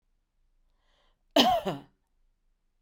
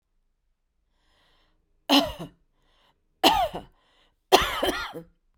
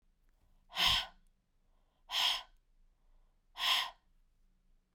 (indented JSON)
{
  "cough_length": "2.8 s",
  "cough_amplitude": 18996,
  "cough_signal_mean_std_ratio": 0.28,
  "three_cough_length": "5.4 s",
  "three_cough_amplitude": 29775,
  "three_cough_signal_mean_std_ratio": 0.32,
  "exhalation_length": "4.9 s",
  "exhalation_amplitude": 4705,
  "exhalation_signal_mean_std_ratio": 0.36,
  "survey_phase": "beta (2021-08-13 to 2022-03-07)",
  "age": "18-44",
  "gender": "Male",
  "wearing_mask": "No",
  "symptom_runny_or_blocked_nose": true,
  "symptom_sore_throat": true,
  "symptom_fatigue": true,
  "symptom_headache": true,
  "symptom_loss_of_taste": true,
  "symptom_onset": "7 days",
  "smoker_status": "Never smoked",
  "respiratory_condition_asthma": false,
  "respiratory_condition_other": false,
  "recruitment_source": "Test and Trace",
  "submission_delay": "6 days",
  "covid_test_result": "Positive",
  "covid_test_method": "RT-qPCR",
  "covid_ct_value": 19.0,
  "covid_ct_gene": "N gene",
  "covid_ct_mean": 19.6,
  "covid_viral_load": "370000 copies/ml",
  "covid_viral_load_category": "Low viral load (10K-1M copies/ml)"
}